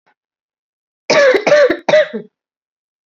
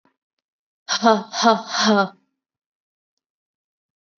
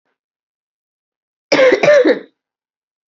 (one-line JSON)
{"three_cough_length": "3.1 s", "three_cough_amplitude": 29586, "three_cough_signal_mean_std_ratio": 0.45, "exhalation_length": "4.2 s", "exhalation_amplitude": 27850, "exhalation_signal_mean_std_ratio": 0.34, "cough_length": "3.1 s", "cough_amplitude": 29993, "cough_signal_mean_std_ratio": 0.38, "survey_phase": "beta (2021-08-13 to 2022-03-07)", "age": "18-44", "gender": "Female", "wearing_mask": "No", "symptom_cough_any": true, "symptom_new_continuous_cough": true, "symptom_runny_or_blocked_nose": true, "symptom_fatigue": true, "symptom_headache": true, "symptom_change_to_sense_of_smell_or_taste": true, "symptom_loss_of_taste": true, "symptom_onset": "3 days", "smoker_status": "Never smoked", "respiratory_condition_asthma": false, "respiratory_condition_other": false, "recruitment_source": "Test and Trace", "submission_delay": "2 days", "covid_test_result": "Positive", "covid_test_method": "RT-qPCR", "covid_ct_value": 15.1, "covid_ct_gene": "ORF1ab gene", "covid_ct_mean": 16.2, "covid_viral_load": "5000000 copies/ml", "covid_viral_load_category": "High viral load (>1M copies/ml)"}